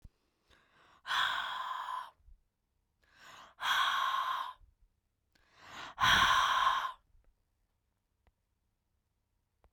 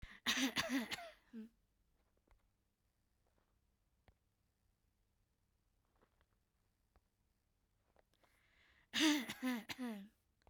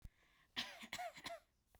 {"exhalation_length": "9.7 s", "exhalation_amplitude": 6766, "exhalation_signal_mean_std_ratio": 0.43, "three_cough_length": "10.5 s", "three_cough_amplitude": 2356, "three_cough_signal_mean_std_ratio": 0.31, "cough_length": "1.8 s", "cough_amplitude": 1141, "cough_signal_mean_std_ratio": 0.52, "survey_phase": "beta (2021-08-13 to 2022-03-07)", "age": "18-44", "gender": "Female", "wearing_mask": "No", "symptom_none": true, "smoker_status": "Never smoked", "respiratory_condition_asthma": false, "respiratory_condition_other": false, "recruitment_source": "REACT", "submission_delay": "12 days", "covid_test_result": "Negative", "covid_test_method": "RT-qPCR"}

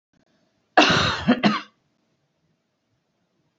{"cough_length": "3.6 s", "cough_amplitude": 30407, "cough_signal_mean_std_ratio": 0.34, "survey_phase": "beta (2021-08-13 to 2022-03-07)", "age": "45-64", "gender": "Female", "wearing_mask": "No", "symptom_none": true, "smoker_status": "Never smoked", "respiratory_condition_asthma": false, "respiratory_condition_other": false, "recruitment_source": "REACT", "submission_delay": "2 days", "covid_test_result": "Negative", "covid_test_method": "RT-qPCR"}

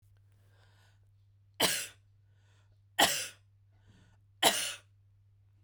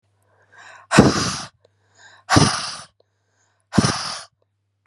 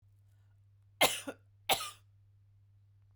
{"three_cough_length": "5.6 s", "three_cough_amplitude": 12330, "three_cough_signal_mean_std_ratio": 0.3, "exhalation_length": "4.9 s", "exhalation_amplitude": 32768, "exhalation_signal_mean_std_ratio": 0.35, "cough_length": "3.2 s", "cough_amplitude": 7897, "cough_signal_mean_std_ratio": 0.27, "survey_phase": "beta (2021-08-13 to 2022-03-07)", "age": "45-64", "gender": "Female", "wearing_mask": "No", "symptom_cough_any": true, "symptom_runny_or_blocked_nose": true, "symptom_sore_throat": true, "symptom_fatigue": true, "symptom_headache": true, "symptom_loss_of_taste": true, "symptom_onset": "3 days", "smoker_status": "Never smoked", "respiratory_condition_asthma": false, "respiratory_condition_other": false, "recruitment_source": "Test and Trace", "submission_delay": "2 days", "covid_test_result": "Positive", "covid_test_method": "RT-qPCR", "covid_ct_value": 27.3, "covid_ct_gene": "ORF1ab gene", "covid_ct_mean": 27.7, "covid_viral_load": "800 copies/ml", "covid_viral_load_category": "Minimal viral load (< 10K copies/ml)"}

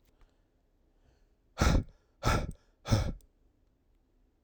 {"exhalation_length": "4.4 s", "exhalation_amplitude": 7628, "exhalation_signal_mean_std_ratio": 0.33, "survey_phase": "alpha (2021-03-01 to 2021-08-12)", "age": "18-44", "gender": "Male", "wearing_mask": "No", "symptom_cough_any": true, "symptom_new_continuous_cough": true, "symptom_fatigue": true, "symptom_onset": "2 days", "smoker_status": "Current smoker (1 to 10 cigarettes per day)", "respiratory_condition_asthma": false, "respiratory_condition_other": false, "recruitment_source": "Test and Trace", "submission_delay": "1 day", "covid_test_result": "Positive", "covid_test_method": "RT-qPCR", "covid_ct_value": 30.7, "covid_ct_gene": "N gene"}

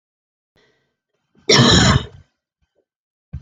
{"cough_length": "3.4 s", "cough_amplitude": 32767, "cough_signal_mean_std_ratio": 0.33, "survey_phase": "alpha (2021-03-01 to 2021-08-12)", "age": "45-64", "gender": "Female", "wearing_mask": "No", "symptom_none": true, "symptom_onset": "3 days", "smoker_status": "Never smoked", "respiratory_condition_asthma": false, "respiratory_condition_other": false, "recruitment_source": "REACT", "submission_delay": "3 days", "covid_test_result": "Negative", "covid_test_method": "RT-qPCR"}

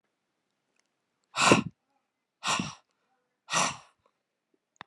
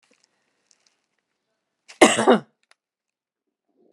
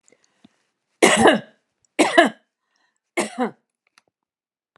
{"exhalation_length": "4.9 s", "exhalation_amplitude": 18912, "exhalation_signal_mean_std_ratio": 0.28, "cough_length": "3.9 s", "cough_amplitude": 32768, "cough_signal_mean_std_ratio": 0.21, "three_cough_length": "4.8 s", "three_cough_amplitude": 32767, "three_cough_signal_mean_std_ratio": 0.31, "survey_phase": "alpha (2021-03-01 to 2021-08-12)", "age": "45-64", "gender": "Female", "wearing_mask": "No", "symptom_none": true, "smoker_status": "Ex-smoker", "respiratory_condition_asthma": false, "respiratory_condition_other": false, "recruitment_source": "REACT", "submission_delay": "1 day", "covid_test_result": "Negative", "covid_test_method": "RT-qPCR"}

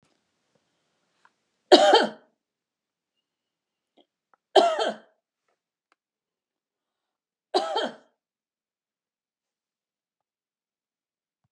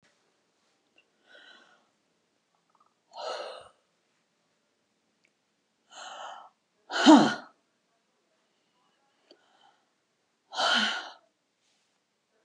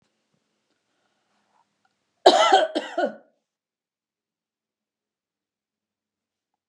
{"three_cough_length": "11.5 s", "three_cough_amplitude": 30653, "three_cough_signal_mean_std_ratio": 0.2, "exhalation_length": "12.4 s", "exhalation_amplitude": 21721, "exhalation_signal_mean_std_ratio": 0.2, "cough_length": "6.7 s", "cough_amplitude": 30548, "cough_signal_mean_std_ratio": 0.22, "survey_phase": "beta (2021-08-13 to 2022-03-07)", "age": "65+", "gender": "Female", "wearing_mask": "No", "symptom_none": true, "smoker_status": "Never smoked", "respiratory_condition_asthma": false, "respiratory_condition_other": false, "recruitment_source": "REACT", "submission_delay": "2 days", "covid_test_result": "Negative", "covid_test_method": "RT-qPCR", "influenza_a_test_result": "Negative", "influenza_b_test_result": "Negative"}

